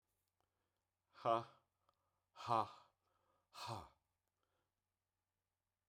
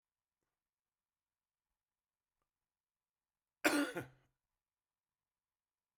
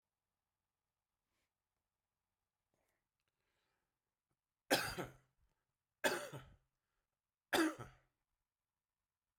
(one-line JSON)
{"exhalation_length": "5.9 s", "exhalation_amplitude": 2283, "exhalation_signal_mean_std_ratio": 0.23, "cough_length": "6.0 s", "cough_amplitude": 5195, "cough_signal_mean_std_ratio": 0.17, "three_cough_length": "9.4 s", "three_cough_amplitude": 3835, "three_cough_signal_mean_std_ratio": 0.22, "survey_phase": "beta (2021-08-13 to 2022-03-07)", "age": "65+", "gender": "Male", "wearing_mask": "No", "symptom_cough_any": true, "symptom_fatigue": true, "symptom_other": true, "smoker_status": "Ex-smoker", "respiratory_condition_asthma": false, "respiratory_condition_other": false, "recruitment_source": "Test and Trace", "submission_delay": "1 day", "covid_test_result": "Positive", "covid_test_method": "LFT"}